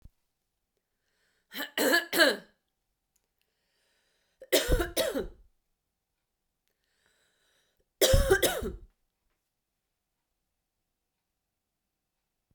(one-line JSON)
{"three_cough_length": "12.5 s", "three_cough_amplitude": 14605, "three_cough_signal_mean_std_ratio": 0.29, "survey_phase": "beta (2021-08-13 to 2022-03-07)", "age": "18-44", "gender": "Female", "wearing_mask": "No", "symptom_none": true, "smoker_status": "Never smoked", "respiratory_condition_asthma": false, "respiratory_condition_other": false, "recruitment_source": "REACT", "submission_delay": "1 day", "covid_test_result": "Negative", "covid_test_method": "RT-qPCR"}